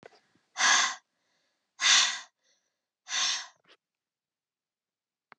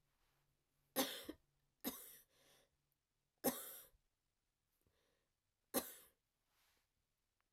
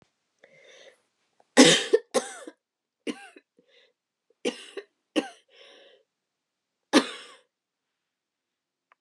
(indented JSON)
{
  "exhalation_length": "5.4 s",
  "exhalation_amplitude": 11271,
  "exhalation_signal_mean_std_ratio": 0.34,
  "three_cough_length": "7.5 s",
  "three_cough_amplitude": 1994,
  "three_cough_signal_mean_std_ratio": 0.25,
  "cough_length": "9.0 s",
  "cough_amplitude": 27410,
  "cough_signal_mean_std_ratio": 0.21,
  "survey_phase": "alpha (2021-03-01 to 2021-08-12)",
  "age": "45-64",
  "gender": "Female",
  "wearing_mask": "No",
  "symptom_cough_any": true,
  "symptom_fatigue": true,
  "symptom_fever_high_temperature": true,
  "symptom_headache": true,
  "symptom_loss_of_taste": true,
  "smoker_status": "Never smoked",
  "respiratory_condition_asthma": false,
  "respiratory_condition_other": false,
  "recruitment_source": "Test and Trace",
  "submission_delay": "2 days",
  "covid_test_result": "Positive",
  "covid_test_method": "RT-qPCR",
  "covid_ct_value": 18.7,
  "covid_ct_gene": "ORF1ab gene",
  "covid_ct_mean": 19.5,
  "covid_viral_load": "390000 copies/ml",
  "covid_viral_load_category": "Low viral load (10K-1M copies/ml)"
}